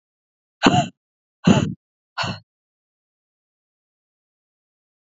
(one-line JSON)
{"exhalation_length": "5.1 s", "exhalation_amplitude": 32768, "exhalation_signal_mean_std_ratio": 0.24, "survey_phase": "alpha (2021-03-01 to 2021-08-12)", "age": "18-44", "gender": "Female", "wearing_mask": "No", "symptom_none": true, "smoker_status": "Never smoked", "respiratory_condition_asthma": false, "respiratory_condition_other": false, "recruitment_source": "REACT", "submission_delay": "1 day", "covid_test_result": "Negative", "covid_test_method": "RT-qPCR"}